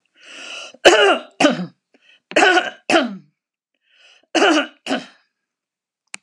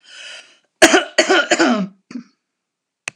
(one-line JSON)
{"three_cough_length": "6.2 s", "three_cough_amplitude": 32768, "three_cough_signal_mean_std_ratio": 0.4, "cough_length": "3.2 s", "cough_amplitude": 32768, "cough_signal_mean_std_ratio": 0.41, "survey_phase": "beta (2021-08-13 to 2022-03-07)", "age": "65+", "gender": "Female", "wearing_mask": "No", "symptom_none": true, "smoker_status": "Never smoked", "respiratory_condition_asthma": true, "respiratory_condition_other": false, "recruitment_source": "REACT", "submission_delay": "3 days", "covid_test_result": "Negative", "covid_test_method": "RT-qPCR", "influenza_a_test_result": "Negative", "influenza_b_test_result": "Negative"}